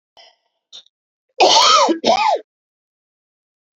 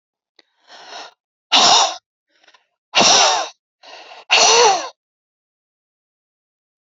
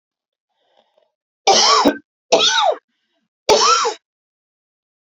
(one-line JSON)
{"cough_length": "3.8 s", "cough_amplitude": 30317, "cough_signal_mean_std_ratio": 0.42, "exhalation_length": "6.8 s", "exhalation_amplitude": 32768, "exhalation_signal_mean_std_ratio": 0.39, "three_cough_length": "5.0 s", "three_cough_amplitude": 32233, "three_cough_signal_mean_std_ratio": 0.43, "survey_phase": "beta (2021-08-13 to 2022-03-07)", "age": "45-64", "gender": "Female", "wearing_mask": "No", "symptom_none": true, "smoker_status": "Ex-smoker", "respiratory_condition_asthma": false, "respiratory_condition_other": false, "recruitment_source": "REACT", "submission_delay": "2 days", "covid_test_result": "Negative", "covid_test_method": "RT-qPCR", "influenza_a_test_result": "Negative", "influenza_b_test_result": "Negative"}